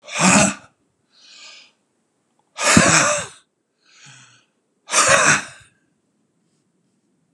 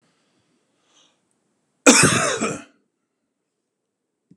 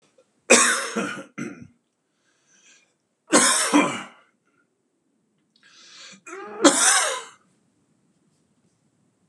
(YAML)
exhalation_length: 7.3 s
exhalation_amplitude: 32768
exhalation_signal_mean_std_ratio: 0.38
cough_length: 4.4 s
cough_amplitude: 32768
cough_signal_mean_std_ratio: 0.27
three_cough_length: 9.3 s
three_cough_amplitude: 31886
three_cough_signal_mean_std_ratio: 0.35
survey_phase: beta (2021-08-13 to 2022-03-07)
age: 45-64
gender: Male
wearing_mask: 'No'
symptom_cough_any: true
symptom_loss_of_taste: true
smoker_status: Ex-smoker
respiratory_condition_asthma: false
respiratory_condition_other: false
recruitment_source: REACT
submission_delay: 1 day
covid_test_result: Negative
covid_test_method: RT-qPCR
influenza_a_test_result: Negative
influenza_b_test_result: Negative